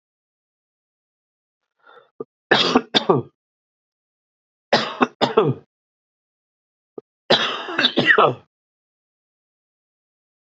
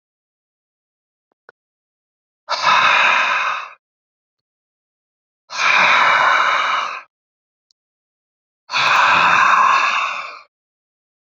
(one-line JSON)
{"three_cough_length": "10.4 s", "three_cough_amplitude": 29819, "three_cough_signal_mean_std_ratio": 0.31, "exhalation_length": "11.3 s", "exhalation_amplitude": 32768, "exhalation_signal_mean_std_ratio": 0.51, "survey_phase": "beta (2021-08-13 to 2022-03-07)", "age": "18-44", "gender": "Male", "wearing_mask": "No", "symptom_new_continuous_cough": true, "symptom_fatigue": true, "symptom_headache": true, "symptom_onset": "3 days", "smoker_status": "Never smoked", "respiratory_condition_asthma": false, "respiratory_condition_other": false, "recruitment_source": "Test and Trace", "submission_delay": "1 day", "covid_test_result": "Positive", "covid_test_method": "RT-qPCR", "covid_ct_value": 28.7, "covid_ct_gene": "N gene"}